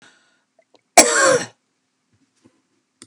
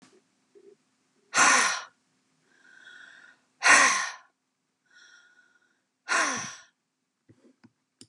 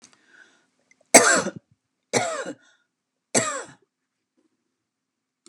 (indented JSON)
{
  "cough_length": "3.1 s",
  "cough_amplitude": 32768,
  "cough_signal_mean_std_ratio": 0.28,
  "exhalation_length": "8.1 s",
  "exhalation_amplitude": 18591,
  "exhalation_signal_mean_std_ratio": 0.31,
  "three_cough_length": "5.5 s",
  "three_cough_amplitude": 32768,
  "three_cough_signal_mean_std_ratio": 0.26,
  "survey_phase": "beta (2021-08-13 to 2022-03-07)",
  "age": "65+",
  "gender": "Female",
  "wearing_mask": "No",
  "symptom_none": true,
  "smoker_status": "Never smoked",
  "respiratory_condition_asthma": false,
  "respiratory_condition_other": false,
  "recruitment_source": "REACT",
  "submission_delay": "2 days",
  "covid_test_result": "Negative",
  "covid_test_method": "RT-qPCR",
  "influenza_a_test_result": "Negative",
  "influenza_b_test_result": "Negative"
}